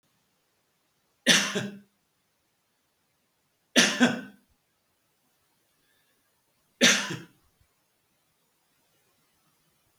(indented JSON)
{
  "three_cough_length": "10.0 s",
  "three_cough_amplitude": 22617,
  "three_cough_signal_mean_std_ratio": 0.24,
  "survey_phase": "beta (2021-08-13 to 2022-03-07)",
  "age": "65+",
  "gender": "Male",
  "wearing_mask": "No",
  "symptom_none": true,
  "smoker_status": "Ex-smoker",
  "respiratory_condition_asthma": false,
  "respiratory_condition_other": false,
  "recruitment_source": "REACT",
  "submission_delay": "2 days",
  "covid_test_result": "Negative",
  "covid_test_method": "RT-qPCR",
  "influenza_a_test_result": "Negative",
  "influenza_b_test_result": "Negative"
}